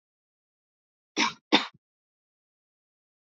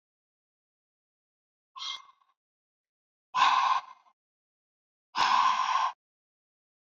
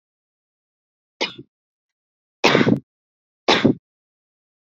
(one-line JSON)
{"cough_length": "3.2 s", "cough_amplitude": 16267, "cough_signal_mean_std_ratio": 0.2, "exhalation_length": "6.8 s", "exhalation_amplitude": 9983, "exhalation_signal_mean_std_ratio": 0.36, "three_cough_length": "4.6 s", "three_cough_amplitude": 28084, "three_cough_signal_mean_std_ratio": 0.28, "survey_phase": "beta (2021-08-13 to 2022-03-07)", "age": "18-44", "gender": "Female", "wearing_mask": "No", "symptom_sore_throat": true, "symptom_diarrhoea": true, "symptom_fatigue": true, "symptom_headache": true, "symptom_onset": "2 days", "smoker_status": "Never smoked", "respiratory_condition_asthma": false, "respiratory_condition_other": false, "recruitment_source": "Test and Trace", "submission_delay": "2 days", "covid_test_result": "Positive", "covid_test_method": "RT-qPCR", "covid_ct_value": 25.3, "covid_ct_gene": "N gene", "covid_ct_mean": 25.7, "covid_viral_load": "3800 copies/ml", "covid_viral_load_category": "Minimal viral load (< 10K copies/ml)"}